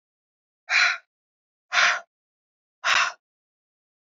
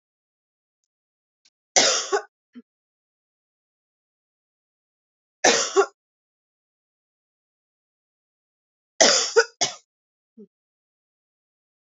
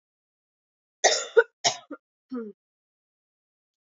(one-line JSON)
{"exhalation_length": "4.0 s", "exhalation_amplitude": 15678, "exhalation_signal_mean_std_ratio": 0.35, "three_cough_length": "11.9 s", "three_cough_amplitude": 29334, "three_cough_signal_mean_std_ratio": 0.23, "cough_length": "3.8 s", "cough_amplitude": 20039, "cough_signal_mean_std_ratio": 0.24, "survey_phase": "beta (2021-08-13 to 2022-03-07)", "age": "18-44", "gender": "Female", "wearing_mask": "No", "symptom_cough_any": true, "symptom_new_continuous_cough": true, "symptom_runny_or_blocked_nose": true, "symptom_shortness_of_breath": true, "symptom_sore_throat": true, "symptom_fatigue": true, "symptom_headache": true, "symptom_onset": "3 days", "smoker_status": "Never smoked", "respiratory_condition_asthma": false, "respiratory_condition_other": false, "recruitment_source": "Test and Trace", "submission_delay": "1 day", "covid_test_result": "Negative", "covid_test_method": "RT-qPCR"}